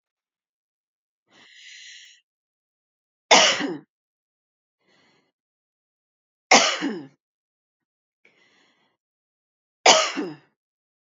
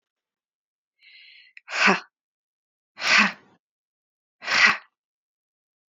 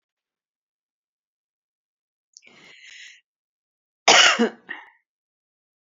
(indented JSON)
{
  "three_cough_length": "11.2 s",
  "three_cough_amplitude": 31019,
  "three_cough_signal_mean_std_ratio": 0.23,
  "exhalation_length": "5.9 s",
  "exhalation_amplitude": 20584,
  "exhalation_signal_mean_std_ratio": 0.29,
  "cough_length": "5.9 s",
  "cough_amplitude": 29135,
  "cough_signal_mean_std_ratio": 0.21,
  "survey_phase": "beta (2021-08-13 to 2022-03-07)",
  "age": "45-64",
  "gender": "Female",
  "wearing_mask": "No",
  "symptom_none": true,
  "smoker_status": "Ex-smoker",
  "respiratory_condition_asthma": false,
  "respiratory_condition_other": false,
  "recruitment_source": "REACT",
  "submission_delay": "3 days",
  "covid_test_result": "Negative",
  "covid_test_method": "RT-qPCR",
  "influenza_a_test_result": "Negative",
  "influenza_b_test_result": "Negative"
}